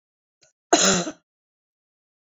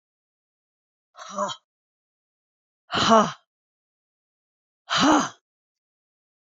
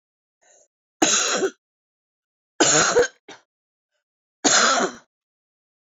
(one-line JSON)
{"cough_length": "2.4 s", "cough_amplitude": 28627, "cough_signal_mean_std_ratio": 0.29, "exhalation_length": "6.6 s", "exhalation_amplitude": 24258, "exhalation_signal_mean_std_ratio": 0.28, "three_cough_length": "6.0 s", "three_cough_amplitude": 25078, "three_cough_signal_mean_std_ratio": 0.4, "survey_phase": "beta (2021-08-13 to 2022-03-07)", "age": "45-64", "gender": "Female", "wearing_mask": "No", "symptom_none": true, "smoker_status": "Never smoked", "respiratory_condition_asthma": true, "respiratory_condition_other": false, "recruitment_source": "REACT", "submission_delay": "2 days", "covid_test_result": "Negative", "covid_test_method": "RT-qPCR"}